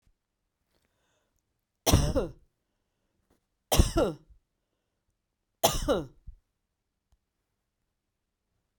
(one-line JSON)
{"three_cough_length": "8.8 s", "three_cough_amplitude": 16359, "three_cough_signal_mean_std_ratio": 0.26, "survey_phase": "beta (2021-08-13 to 2022-03-07)", "age": "45-64", "gender": "Female", "wearing_mask": "No", "symptom_none": true, "smoker_status": "Never smoked", "respiratory_condition_asthma": false, "respiratory_condition_other": false, "recruitment_source": "REACT", "submission_delay": "1 day", "covid_test_result": "Negative", "covid_test_method": "RT-qPCR", "influenza_a_test_result": "Negative", "influenza_b_test_result": "Negative"}